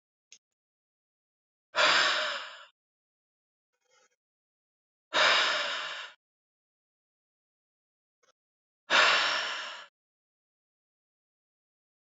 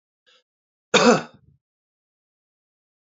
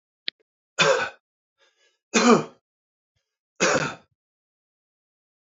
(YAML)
exhalation_length: 12.1 s
exhalation_amplitude: 11362
exhalation_signal_mean_std_ratio: 0.33
cough_length: 3.2 s
cough_amplitude: 27769
cough_signal_mean_std_ratio: 0.22
three_cough_length: 5.5 s
three_cough_amplitude: 24956
three_cough_signal_mean_std_ratio: 0.3
survey_phase: beta (2021-08-13 to 2022-03-07)
age: 45-64
gender: Male
wearing_mask: 'No'
symptom_none: true
smoker_status: Never smoked
respiratory_condition_asthma: false
respiratory_condition_other: false
recruitment_source: Test and Trace
submission_delay: 2 days
covid_test_result: Positive
covid_test_method: ePCR